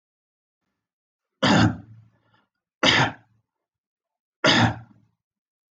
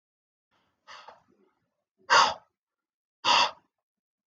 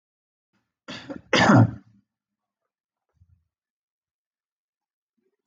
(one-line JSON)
{"three_cough_length": "5.7 s", "three_cough_amplitude": 23758, "three_cough_signal_mean_std_ratio": 0.33, "exhalation_length": "4.3 s", "exhalation_amplitude": 13446, "exhalation_signal_mean_std_ratio": 0.27, "cough_length": "5.5 s", "cough_amplitude": 19905, "cough_signal_mean_std_ratio": 0.22, "survey_phase": "beta (2021-08-13 to 2022-03-07)", "age": "45-64", "gender": "Male", "wearing_mask": "No", "symptom_none": true, "smoker_status": "Ex-smoker", "respiratory_condition_asthma": false, "respiratory_condition_other": false, "recruitment_source": "REACT", "submission_delay": "3 days", "covid_test_result": "Negative", "covid_test_method": "RT-qPCR"}